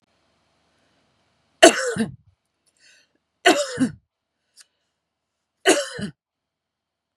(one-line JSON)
{"three_cough_length": "7.2 s", "three_cough_amplitude": 32768, "three_cough_signal_mean_std_ratio": 0.25, "survey_phase": "beta (2021-08-13 to 2022-03-07)", "age": "45-64", "gender": "Female", "wearing_mask": "No", "symptom_none": true, "smoker_status": "Never smoked", "respiratory_condition_asthma": false, "respiratory_condition_other": false, "recruitment_source": "REACT", "submission_delay": "2 days", "covid_test_result": "Negative", "covid_test_method": "RT-qPCR", "influenza_a_test_result": "Negative", "influenza_b_test_result": "Negative"}